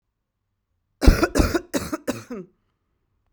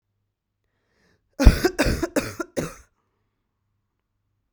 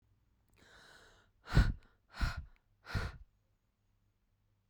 {"three_cough_length": "3.3 s", "three_cough_amplitude": 32768, "three_cough_signal_mean_std_ratio": 0.31, "cough_length": "4.5 s", "cough_amplitude": 32767, "cough_signal_mean_std_ratio": 0.26, "exhalation_length": "4.7 s", "exhalation_amplitude": 5440, "exhalation_signal_mean_std_ratio": 0.27, "survey_phase": "beta (2021-08-13 to 2022-03-07)", "age": "18-44", "gender": "Female", "wearing_mask": "No", "symptom_cough_any": true, "symptom_runny_or_blocked_nose": true, "symptom_fatigue": true, "symptom_other": true, "smoker_status": "Ex-smoker", "respiratory_condition_asthma": true, "respiratory_condition_other": false, "recruitment_source": "REACT", "submission_delay": "3 days", "covid_test_result": "Positive", "covid_test_method": "RT-qPCR", "covid_ct_value": 30.0, "covid_ct_gene": "E gene", "influenza_a_test_result": "Negative", "influenza_b_test_result": "Negative"}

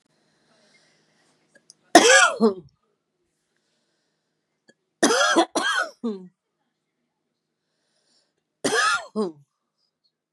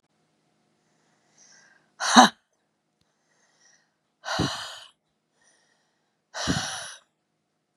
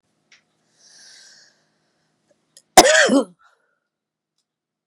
{"three_cough_length": "10.3 s", "three_cough_amplitude": 32768, "three_cough_signal_mean_std_ratio": 0.31, "exhalation_length": "7.8 s", "exhalation_amplitude": 32694, "exhalation_signal_mean_std_ratio": 0.22, "cough_length": "4.9 s", "cough_amplitude": 32768, "cough_signal_mean_std_ratio": 0.23, "survey_phase": "beta (2021-08-13 to 2022-03-07)", "age": "45-64", "gender": "Female", "wearing_mask": "No", "symptom_runny_or_blocked_nose": true, "symptom_abdominal_pain": true, "symptom_fatigue": true, "symptom_headache": true, "smoker_status": "Current smoker (e-cigarettes or vapes only)", "respiratory_condition_asthma": false, "respiratory_condition_other": false, "recruitment_source": "Test and Trace", "submission_delay": "1 day", "covid_test_result": "Positive", "covid_test_method": "RT-qPCR", "covid_ct_value": 27.2, "covid_ct_gene": "ORF1ab gene", "covid_ct_mean": 28.2, "covid_viral_load": "560 copies/ml", "covid_viral_load_category": "Minimal viral load (< 10K copies/ml)"}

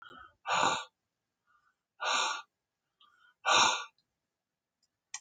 {"exhalation_length": "5.2 s", "exhalation_amplitude": 7965, "exhalation_signal_mean_std_ratio": 0.36, "survey_phase": "alpha (2021-03-01 to 2021-08-12)", "age": "65+", "gender": "Male", "wearing_mask": "No", "symptom_none": true, "smoker_status": "Current smoker (11 or more cigarettes per day)", "respiratory_condition_asthma": false, "respiratory_condition_other": false, "recruitment_source": "REACT", "submission_delay": "1 day", "covid_test_result": "Negative", "covid_test_method": "RT-qPCR"}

